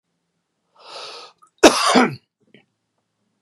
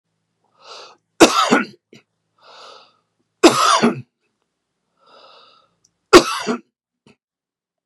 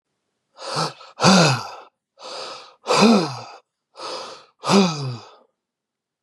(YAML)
cough_length: 3.4 s
cough_amplitude: 32768
cough_signal_mean_std_ratio: 0.28
three_cough_length: 7.9 s
three_cough_amplitude: 32768
three_cough_signal_mean_std_ratio: 0.28
exhalation_length: 6.2 s
exhalation_amplitude: 32478
exhalation_signal_mean_std_ratio: 0.43
survey_phase: beta (2021-08-13 to 2022-03-07)
age: 45-64
gender: Male
wearing_mask: 'No'
symptom_none: true
smoker_status: Ex-smoker
respiratory_condition_asthma: false
respiratory_condition_other: false
recruitment_source: REACT
submission_delay: 1 day
covid_test_result: Negative
covid_test_method: RT-qPCR
influenza_a_test_result: Negative
influenza_b_test_result: Negative